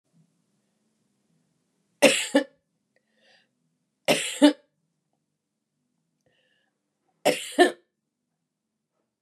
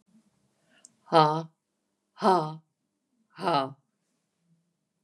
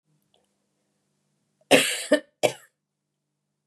three_cough_length: 9.2 s
three_cough_amplitude: 26220
three_cough_signal_mean_std_ratio: 0.22
exhalation_length: 5.0 s
exhalation_amplitude: 20166
exhalation_signal_mean_std_ratio: 0.28
cough_length: 3.7 s
cough_amplitude: 30432
cough_signal_mean_std_ratio: 0.24
survey_phase: beta (2021-08-13 to 2022-03-07)
age: 45-64
gender: Female
wearing_mask: 'No'
symptom_cough_any: true
symptom_runny_or_blocked_nose: true
symptom_fatigue: true
symptom_headache: true
symptom_change_to_sense_of_smell_or_taste: true
symptom_loss_of_taste: true
symptom_onset: 9 days
smoker_status: Ex-smoker
respiratory_condition_asthma: false
respiratory_condition_other: false
recruitment_source: Test and Trace
submission_delay: 1 day
covid_test_result: Positive
covid_test_method: RT-qPCR
covid_ct_value: 29.5
covid_ct_gene: ORF1ab gene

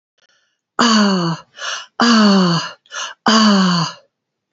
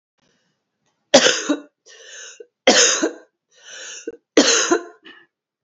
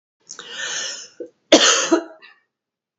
exhalation_length: 4.5 s
exhalation_amplitude: 30512
exhalation_signal_mean_std_ratio: 0.63
three_cough_length: 5.6 s
three_cough_amplitude: 32768
three_cough_signal_mean_std_ratio: 0.38
cough_length: 3.0 s
cough_amplitude: 30317
cough_signal_mean_std_ratio: 0.38
survey_phase: beta (2021-08-13 to 2022-03-07)
age: 45-64
gender: Female
wearing_mask: 'No'
symptom_cough_any: true
symptom_new_continuous_cough: true
symptom_runny_or_blocked_nose: true
symptom_shortness_of_breath: true
symptom_fever_high_temperature: true
symptom_headache: true
symptom_change_to_sense_of_smell_or_taste: true
symptom_loss_of_taste: true
symptom_onset: 4 days
smoker_status: Never smoked
respiratory_condition_asthma: true
respiratory_condition_other: false
recruitment_source: Test and Trace
submission_delay: 2 days
covid_test_result: Positive
covid_test_method: RT-qPCR
covid_ct_value: 27.4
covid_ct_gene: N gene
covid_ct_mean: 27.5
covid_viral_load: 920 copies/ml
covid_viral_load_category: Minimal viral load (< 10K copies/ml)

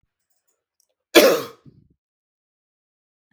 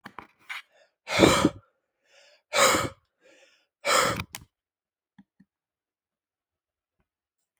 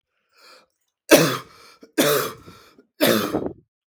cough_length: 3.3 s
cough_amplitude: 32768
cough_signal_mean_std_ratio: 0.21
exhalation_length: 7.6 s
exhalation_amplitude: 24315
exhalation_signal_mean_std_ratio: 0.3
three_cough_length: 3.9 s
three_cough_amplitude: 32768
three_cough_signal_mean_std_ratio: 0.39
survey_phase: beta (2021-08-13 to 2022-03-07)
age: 18-44
gender: Male
wearing_mask: 'No'
symptom_cough_any: true
symptom_fatigue: true
smoker_status: Never smoked
respiratory_condition_asthma: false
respiratory_condition_other: false
recruitment_source: REACT
submission_delay: 1 day
covid_test_result: Negative
covid_test_method: RT-qPCR
influenza_a_test_result: Negative
influenza_b_test_result: Negative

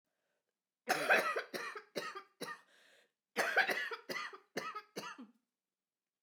three_cough_length: 6.2 s
three_cough_amplitude: 4765
three_cough_signal_mean_std_ratio: 0.43
survey_phase: beta (2021-08-13 to 2022-03-07)
age: 45-64
gender: Female
wearing_mask: 'No'
symptom_cough_any: true
symptom_runny_or_blocked_nose: true
symptom_shortness_of_breath: true
symptom_onset: 9 days
smoker_status: Never smoked
respiratory_condition_asthma: true
respiratory_condition_other: false
recruitment_source: REACT
submission_delay: 1 day
covid_test_result: Negative
covid_test_method: RT-qPCR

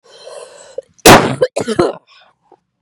cough_length: 2.8 s
cough_amplitude: 32768
cough_signal_mean_std_ratio: 0.36
survey_phase: beta (2021-08-13 to 2022-03-07)
age: 18-44
gender: Female
wearing_mask: 'No'
symptom_cough_any: true
symptom_runny_or_blocked_nose: true
symptom_shortness_of_breath: true
symptom_sore_throat: true
symptom_diarrhoea: true
symptom_fatigue: true
symptom_headache: true
symptom_change_to_sense_of_smell_or_taste: true
symptom_loss_of_taste: true
symptom_onset: 3 days
smoker_status: Current smoker (1 to 10 cigarettes per day)
respiratory_condition_asthma: true
respiratory_condition_other: false
recruitment_source: Test and Trace
submission_delay: 1 day
covid_test_result: Positive
covid_test_method: RT-qPCR
covid_ct_value: 13.6
covid_ct_gene: ORF1ab gene
covid_ct_mean: 13.9
covid_viral_load: 27000000 copies/ml
covid_viral_load_category: High viral load (>1M copies/ml)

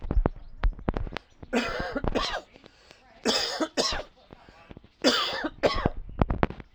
three_cough_length: 6.7 s
three_cough_amplitude: 32267
three_cough_signal_mean_std_ratio: 0.56
survey_phase: alpha (2021-03-01 to 2021-08-12)
age: 45-64
gender: Male
wearing_mask: 'No'
symptom_cough_any: true
symptom_shortness_of_breath: true
symptom_fatigue: true
symptom_headache: true
symptom_change_to_sense_of_smell_or_taste: true
symptom_loss_of_taste: true
symptom_onset: 4 days
smoker_status: Never smoked
respiratory_condition_asthma: false
respiratory_condition_other: true
recruitment_source: Test and Trace
submission_delay: 2 days
covid_test_result: Positive
covid_test_method: RT-qPCR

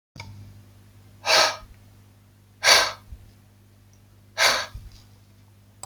exhalation_length: 5.9 s
exhalation_amplitude: 27909
exhalation_signal_mean_std_ratio: 0.34
survey_phase: beta (2021-08-13 to 2022-03-07)
age: 45-64
gender: Male
wearing_mask: 'No'
symptom_sore_throat: true
symptom_onset: 12 days
smoker_status: Ex-smoker
respiratory_condition_asthma: false
respiratory_condition_other: false
recruitment_source: REACT
submission_delay: 5 days
covid_test_result: Negative
covid_test_method: RT-qPCR
influenza_a_test_result: Negative
influenza_b_test_result: Negative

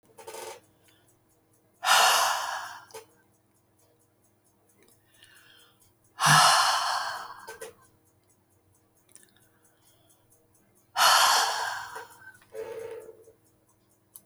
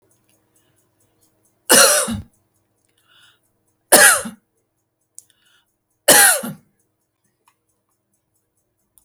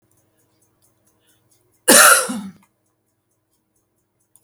exhalation_length: 14.3 s
exhalation_amplitude: 15746
exhalation_signal_mean_std_ratio: 0.36
three_cough_length: 9.0 s
three_cough_amplitude: 32768
three_cough_signal_mean_std_ratio: 0.27
cough_length: 4.4 s
cough_amplitude: 32768
cough_signal_mean_std_ratio: 0.25
survey_phase: beta (2021-08-13 to 2022-03-07)
age: 65+
gender: Female
wearing_mask: 'No'
symptom_none: true
smoker_status: Ex-smoker
respiratory_condition_asthma: false
respiratory_condition_other: false
recruitment_source: REACT
submission_delay: 3 days
covid_test_result: Negative
covid_test_method: RT-qPCR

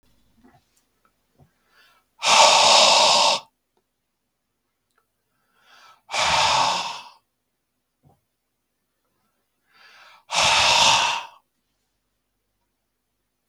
exhalation_length: 13.5 s
exhalation_amplitude: 32766
exhalation_signal_mean_std_ratio: 0.37
survey_phase: beta (2021-08-13 to 2022-03-07)
age: 45-64
gender: Male
wearing_mask: 'No'
symptom_none: true
smoker_status: Never smoked
respiratory_condition_asthma: false
respiratory_condition_other: false
recruitment_source: Test and Trace
submission_delay: 0 days
covid_test_result: Negative
covid_test_method: LFT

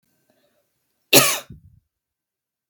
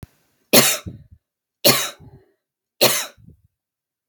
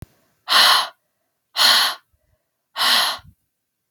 cough_length: 2.7 s
cough_amplitude: 32768
cough_signal_mean_std_ratio: 0.22
three_cough_length: 4.1 s
three_cough_amplitude: 32768
three_cough_signal_mean_std_ratio: 0.31
exhalation_length: 3.9 s
exhalation_amplitude: 32767
exhalation_signal_mean_std_ratio: 0.44
survey_phase: beta (2021-08-13 to 2022-03-07)
age: 18-44
gender: Female
wearing_mask: 'No'
symptom_sore_throat: true
smoker_status: Never smoked
respiratory_condition_asthma: false
respiratory_condition_other: false
recruitment_source: Test and Trace
submission_delay: 1 day
covid_test_result: Positive
covid_test_method: RT-qPCR
covid_ct_value: 27.6
covid_ct_gene: ORF1ab gene
covid_ct_mean: 28.0
covid_viral_load: 650 copies/ml
covid_viral_load_category: Minimal viral load (< 10K copies/ml)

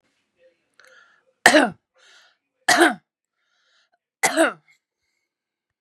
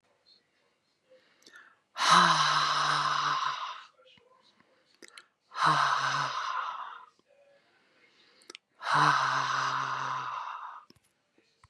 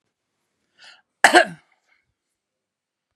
three_cough_length: 5.8 s
three_cough_amplitude: 32768
three_cough_signal_mean_std_ratio: 0.27
exhalation_length: 11.7 s
exhalation_amplitude: 14436
exhalation_signal_mean_std_ratio: 0.52
cough_length: 3.2 s
cough_amplitude: 32768
cough_signal_mean_std_ratio: 0.18
survey_phase: beta (2021-08-13 to 2022-03-07)
age: 45-64
gender: Female
wearing_mask: 'No'
symptom_none: true
smoker_status: Never smoked
respiratory_condition_asthma: false
respiratory_condition_other: false
recruitment_source: REACT
submission_delay: 0 days
covid_test_result: Negative
covid_test_method: RT-qPCR
influenza_a_test_result: Negative
influenza_b_test_result: Negative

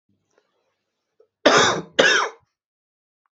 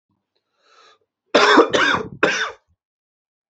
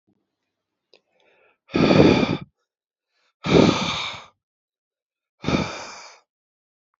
cough_length: 3.3 s
cough_amplitude: 32723
cough_signal_mean_std_ratio: 0.35
three_cough_length: 3.5 s
three_cough_amplitude: 31707
three_cough_signal_mean_std_ratio: 0.4
exhalation_length: 7.0 s
exhalation_amplitude: 30365
exhalation_signal_mean_std_ratio: 0.35
survey_phase: beta (2021-08-13 to 2022-03-07)
age: 18-44
gender: Male
wearing_mask: 'No'
symptom_cough_any: true
symptom_runny_or_blocked_nose: true
symptom_fatigue: true
symptom_fever_high_temperature: true
symptom_headache: true
symptom_onset: 3 days
smoker_status: Ex-smoker
respiratory_condition_asthma: false
respiratory_condition_other: false
recruitment_source: REACT
submission_delay: 1 day
covid_test_method: RT-qPCR
influenza_a_test_result: Negative
influenza_b_test_result: Negative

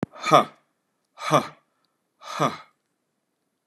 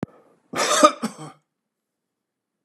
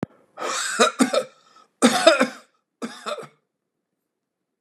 exhalation_length: 3.7 s
exhalation_amplitude: 28845
exhalation_signal_mean_std_ratio: 0.28
cough_length: 2.6 s
cough_amplitude: 32362
cough_signal_mean_std_ratio: 0.29
three_cough_length: 4.6 s
three_cough_amplitude: 32458
three_cough_signal_mean_std_ratio: 0.38
survey_phase: beta (2021-08-13 to 2022-03-07)
age: 45-64
gender: Male
wearing_mask: 'No'
symptom_cough_any: true
symptom_runny_or_blocked_nose: true
symptom_onset: 6 days
smoker_status: Never smoked
respiratory_condition_asthma: false
respiratory_condition_other: false
recruitment_source: REACT
submission_delay: 1 day
covid_test_result: Negative
covid_test_method: RT-qPCR
influenza_a_test_result: Negative
influenza_b_test_result: Negative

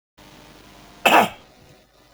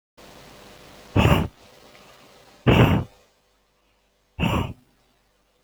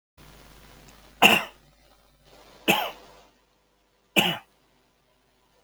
cough_length: 2.1 s
cough_amplitude: 27912
cough_signal_mean_std_ratio: 0.28
exhalation_length: 5.6 s
exhalation_amplitude: 25873
exhalation_signal_mean_std_ratio: 0.34
three_cough_length: 5.6 s
three_cough_amplitude: 30052
three_cough_signal_mean_std_ratio: 0.26
survey_phase: alpha (2021-03-01 to 2021-08-12)
age: 65+
gender: Male
wearing_mask: 'No'
symptom_none: true
smoker_status: Ex-smoker
respiratory_condition_asthma: false
respiratory_condition_other: true
recruitment_source: REACT
submission_delay: 2 days
covid_test_result: Negative
covid_test_method: RT-qPCR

